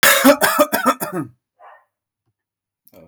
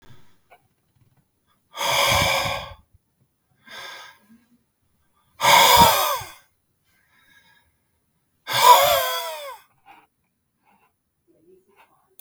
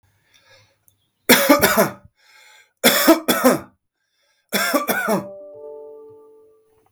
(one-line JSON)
{"cough_length": "3.1 s", "cough_amplitude": 31072, "cough_signal_mean_std_ratio": 0.43, "exhalation_length": "12.2 s", "exhalation_amplitude": 32768, "exhalation_signal_mean_std_ratio": 0.34, "three_cough_length": "6.9 s", "three_cough_amplitude": 32768, "three_cough_signal_mean_std_ratio": 0.42, "survey_phase": "beta (2021-08-13 to 2022-03-07)", "age": "45-64", "gender": "Male", "wearing_mask": "No", "symptom_none": true, "smoker_status": "Ex-smoker", "respiratory_condition_asthma": false, "respiratory_condition_other": false, "recruitment_source": "REACT", "submission_delay": "1 day", "covid_test_result": "Negative", "covid_test_method": "RT-qPCR", "influenza_a_test_result": "Negative", "influenza_b_test_result": "Negative"}